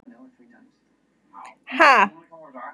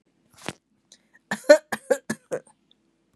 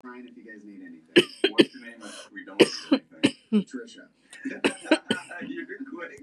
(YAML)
exhalation_length: 2.7 s
exhalation_amplitude: 32587
exhalation_signal_mean_std_ratio: 0.29
cough_length: 3.2 s
cough_amplitude: 27332
cough_signal_mean_std_ratio: 0.21
three_cough_length: 6.2 s
three_cough_amplitude: 25525
three_cough_signal_mean_std_ratio: 0.35
survey_phase: beta (2021-08-13 to 2022-03-07)
age: 45-64
gender: Female
wearing_mask: 'No'
symptom_runny_or_blocked_nose: true
symptom_sore_throat: true
symptom_diarrhoea: true
symptom_fatigue: true
symptom_headache: true
symptom_onset: 12 days
smoker_status: Never smoked
respiratory_condition_asthma: false
respiratory_condition_other: false
recruitment_source: REACT
submission_delay: -1 day
covid_test_result: Negative
covid_test_method: RT-qPCR
covid_ct_value: 38.0
covid_ct_gene: N gene
influenza_a_test_result: Negative
influenza_b_test_result: Negative